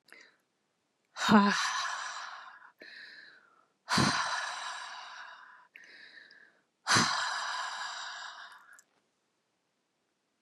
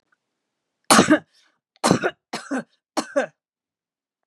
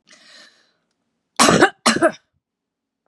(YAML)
exhalation_length: 10.4 s
exhalation_amplitude: 12213
exhalation_signal_mean_std_ratio: 0.42
three_cough_length: 4.3 s
three_cough_amplitude: 32733
three_cough_signal_mean_std_ratio: 0.31
cough_length: 3.1 s
cough_amplitude: 32768
cough_signal_mean_std_ratio: 0.32
survey_phase: beta (2021-08-13 to 2022-03-07)
age: 65+
gender: Female
wearing_mask: 'No'
symptom_none: true
smoker_status: Never smoked
respiratory_condition_asthma: false
respiratory_condition_other: false
recruitment_source: REACT
submission_delay: 2 days
covid_test_result: Negative
covid_test_method: RT-qPCR
influenza_a_test_result: Negative
influenza_b_test_result: Negative